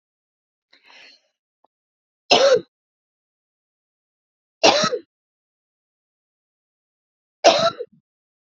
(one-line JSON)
{"three_cough_length": "8.5 s", "three_cough_amplitude": 32768, "three_cough_signal_mean_std_ratio": 0.25, "survey_phase": "beta (2021-08-13 to 2022-03-07)", "age": "18-44", "gender": "Female", "wearing_mask": "No", "symptom_none": true, "smoker_status": "Current smoker (1 to 10 cigarettes per day)", "respiratory_condition_asthma": true, "respiratory_condition_other": false, "recruitment_source": "REACT", "submission_delay": "4 days", "covid_test_result": "Negative", "covid_test_method": "RT-qPCR"}